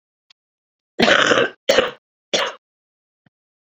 {"cough_length": "3.7 s", "cough_amplitude": 29542, "cough_signal_mean_std_ratio": 0.37, "survey_phase": "beta (2021-08-13 to 2022-03-07)", "age": "18-44", "gender": "Female", "wearing_mask": "No", "symptom_cough_any": true, "symptom_runny_or_blocked_nose": true, "symptom_shortness_of_breath": true, "symptom_fatigue": true, "symptom_fever_high_temperature": true, "symptom_headache": true, "symptom_change_to_sense_of_smell_or_taste": true, "symptom_loss_of_taste": true, "symptom_other": true, "symptom_onset": "3 days", "smoker_status": "Never smoked", "respiratory_condition_asthma": true, "respiratory_condition_other": false, "recruitment_source": "Test and Trace", "submission_delay": "2 days", "covid_test_result": "Positive", "covid_test_method": "RT-qPCR", "covid_ct_value": 11.1, "covid_ct_gene": "ORF1ab gene", "covid_ct_mean": 11.7, "covid_viral_load": "150000000 copies/ml", "covid_viral_load_category": "High viral load (>1M copies/ml)"}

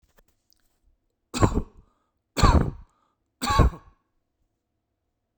{"three_cough_length": "5.4 s", "three_cough_amplitude": 23151, "three_cough_signal_mean_std_ratio": 0.3, "survey_phase": "beta (2021-08-13 to 2022-03-07)", "age": "45-64", "gender": "Male", "wearing_mask": "No", "symptom_cough_any": true, "smoker_status": "Never smoked", "respiratory_condition_asthma": false, "respiratory_condition_other": false, "recruitment_source": "REACT", "submission_delay": "1 day", "covid_test_result": "Negative", "covid_test_method": "RT-qPCR", "influenza_a_test_result": "Negative", "influenza_b_test_result": "Negative"}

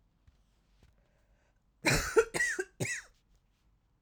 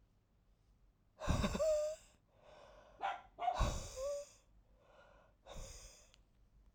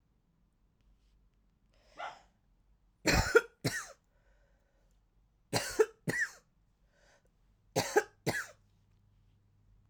{"cough_length": "4.0 s", "cough_amplitude": 8135, "cough_signal_mean_std_ratio": 0.34, "exhalation_length": "6.7 s", "exhalation_amplitude": 2894, "exhalation_signal_mean_std_ratio": 0.46, "three_cough_length": "9.9 s", "three_cough_amplitude": 9234, "three_cough_signal_mean_std_ratio": 0.27, "survey_phase": "alpha (2021-03-01 to 2021-08-12)", "age": "18-44", "gender": "Female", "wearing_mask": "No", "symptom_cough_any": true, "symptom_shortness_of_breath": true, "symptom_fatigue": true, "symptom_headache": true, "smoker_status": "Ex-smoker", "respiratory_condition_asthma": true, "respiratory_condition_other": false, "recruitment_source": "Test and Trace", "submission_delay": "2 days", "covid_test_result": "Positive", "covid_test_method": "LFT"}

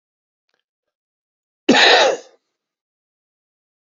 {"cough_length": "3.8 s", "cough_amplitude": 31434, "cough_signal_mean_std_ratio": 0.28, "survey_phase": "beta (2021-08-13 to 2022-03-07)", "age": "65+", "gender": "Male", "wearing_mask": "No", "symptom_cough_any": true, "symptom_runny_or_blocked_nose": true, "symptom_sore_throat": true, "symptom_headache": true, "symptom_other": true, "symptom_onset": "4 days", "smoker_status": "Ex-smoker", "respiratory_condition_asthma": false, "respiratory_condition_other": true, "recruitment_source": "Test and Trace", "submission_delay": "1 day", "covid_test_result": "Positive", "covid_test_method": "RT-qPCR", "covid_ct_value": 17.8, "covid_ct_gene": "ORF1ab gene", "covid_ct_mean": 18.3, "covid_viral_load": "990000 copies/ml", "covid_viral_load_category": "Low viral load (10K-1M copies/ml)"}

